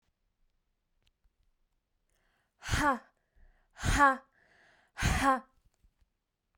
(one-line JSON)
{"exhalation_length": "6.6 s", "exhalation_amplitude": 9694, "exhalation_signal_mean_std_ratio": 0.31, "survey_phase": "beta (2021-08-13 to 2022-03-07)", "age": "45-64", "gender": "Female", "wearing_mask": "No", "symptom_none": true, "smoker_status": "Never smoked", "respiratory_condition_asthma": false, "respiratory_condition_other": false, "recruitment_source": "REACT", "submission_delay": "4 days", "covid_test_result": "Negative", "covid_test_method": "RT-qPCR"}